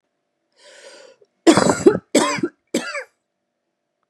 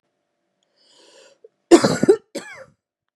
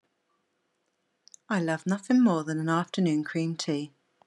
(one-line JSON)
{"three_cough_length": "4.1 s", "three_cough_amplitude": 32762, "three_cough_signal_mean_std_ratio": 0.34, "cough_length": "3.2 s", "cough_amplitude": 32768, "cough_signal_mean_std_ratio": 0.25, "exhalation_length": "4.3 s", "exhalation_amplitude": 7673, "exhalation_signal_mean_std_ratio": 0.56, "survey_phase": "beta (2021-08-13 to 2022-03-07)", "age": "18-44", "gender": "Female", "wearing_mask": "No", "symptom_none": true, "smoker_status": "Ex-smoker", "respiratory_condition_asthma": false, "respiratory_condition_other": false, "recruitment_source": "REACT", "submission_delay": "10 days", "covid_test_result": "Negative", "covid_test_method": "RT-qPCR"}